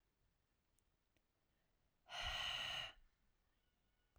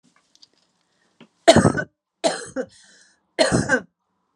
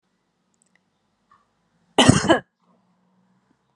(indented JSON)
{
  "exhalation_length": "4.2 s",
  "exhalation_amplitude": 742,
  "exhalation_signal_mean_std_ratio": 0.39,
  "three_cough_length": "4.4 s",
  "three_cough_amplitude": 32768,
  "three_cough_signal_mean_std_ratio": 0.32,
  "cough_length": "3.8 s",
  "cough_amplitude": 32768,
  "cough_signal_mean_std_ratio": 0.23,
  "survey_phase": "alpha (2021-03-01 to 2021-08-12)",
  "age": "18-44",
  "gender": "Female",
  "wearing_mask": "No",
  "symptom_none": true,
  "smoker_status": "Ex-smoker",
  "respiratory_condition_asthma": false,
  "respiratory_condition_other": false,
  "recruitment_source": "REACT",
  "submission_delay": "34 days",
  "covid_test_result": "Negative",
  "covid_test_method": "RT-qPCR"
}